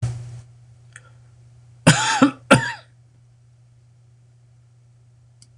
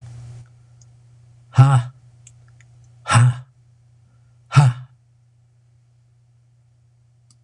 cough_length: 5.6 s
cough_amplitude: 26028
cough_signal_mean_std_ratio: 0.29
exhalation_length: 7.4 s
exhalation_amplitude: 26027
exhalation_signal_mean_std_ratio: 0.29
survey_phase: beta (2021-08-13 to 2022-03-07)
age: 65+
gender: Male
wearing_mask: 'No'
symptom_none: true
smoker_status: Never smoked
respiratory_condition_asthma: false
respiratory_condition_other: false
recruitment_source: REACT
submission_delay: 3 days
covid_test_result: Negative
covid_test_method: RT-qPCR
influenza_a_test_result: Unknown/Void
influenza_b_test_result: Unknown/Void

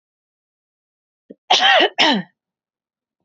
cough_length: 3.2 s
cough_amplitude: 29688
cough_signal_mean_std_ratio: 0.35
survey_phase: beta (2021-08-13 to 2022-03-07)
age: 18-44
gender: Female
wearing_mask: 'No'
symptom_cough_any: true
symptom_runny_or_blocked_nose: true
symptom_change_to_sense_of_smell_or_taste: true
symptom_onset: 4 days
smoker_status: Never smoked
respiratory_condition_asthma: true
respiratory_condition_other: false
recruitment_source: REACT
submission_delay: 4 days
covid_test_result: Positive
covid_test_method: RT-qPCR
covid_ct_value: 24.9
covid_ct_gene: N gene
influenza_a_test_result: Negative
influenza_b_test_result: Negative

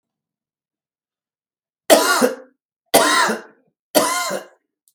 three_cough_length: 4.9 s
three_cough_amplitude: 32768
three_cough_signal_mean_std_ratio: 0.39
survey_phase: beta (2021-08-13 to 2022-03-07)
age: 65+
gender: Male
wearing_mask: 'No'
symptom_none: true
smoker_status: Never smoked
respiratory_condition_asthma: true
respiratory_condition_other: false
recruitment_source: REACT
submission_delay: 3 days
covid_test_result: Negative
covid_test_method: RT-qPCR
influenza_a_test_result: Negative
influenza_b_test_result: Negative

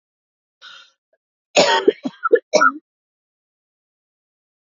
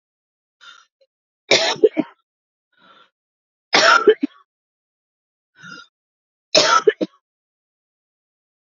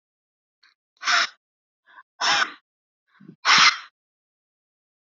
cough_length: 4.6 s
cough_amplitude: 28939
cough_signal_mean_std_ratio: 0.29
three_cough_length: 8.8 s
three_cough_amplitude: 32621
three_cough_signal_mean_std_ratio: 0.28
exhalation_length: 5.0 s
exhalation_amplitude: 23893
exhalation_signal_mean_std_ratio: 0.31
survey_phase: beta (2021-08-13 to 2022-03-07)
age: 18-44
gender: Female
wearing_mask: 'No'
symptom_cough_any: true
symptom_fatigue: true
symptom_headache: true
symptom_change_to_sense_of_smell_or_taste: true
symptom_loss_of_taste: true
symptom_onset: 9 days
smoker_status: Ex-smoker
respiratory_condition_asthma: true
respiratory_condition_other: false
recruitment_source: REACT
submission_delay: 2 days
covid_test_result: Positive
covid_test_method: RT-qPCR
covid_ct_value: 31.0
covid_ct_gene: E gene
influenza_a_test_result: Negative
influenza_b_test_result: Negative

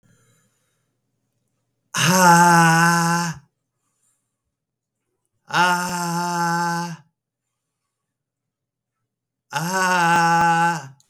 exhalation_length: 11.1 s
exhalation_amplitude: 27848
exhalation_signal_mean_std_ratio: 0.5
survey_phase: beta (2021-08-13 to 2022-03-07)
age: 45-64
gender: Male
wearing_mask: 'No'
symptom_none: true
smoker_status: Ex-smoker
respiratory_condition_asthma: false
respiratory_condition_other: false
recruitment_source: REACT
submission_delay: 22 days
covid_test_result: Negative
covid_test_method: RT-qPCR
influenza_a_test_result: Negative
influenza_b_test_result: Negative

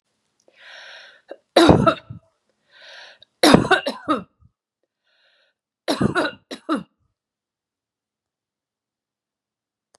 three_cough_length: 10.0 s
three_cough_amplitude: 32768
three_cough_signal_mean_std_ratio: 0.27
survey_phase: beta (2021-08-13 to 2022-03-07)
age: 65+
gender: Female
wearing_mask: 'No'
symptom_none: true
smoker_status: Ex-smoker
respiratory_condition_asthma: false
respiratory_condition_other: false
recruitment_source: REACT
submission_delay: 4 days
covid_test_result: Negative
covid_test_method: RT-qPCR
influenza_a_test_result: Negative
influenza_b_test_result: Negative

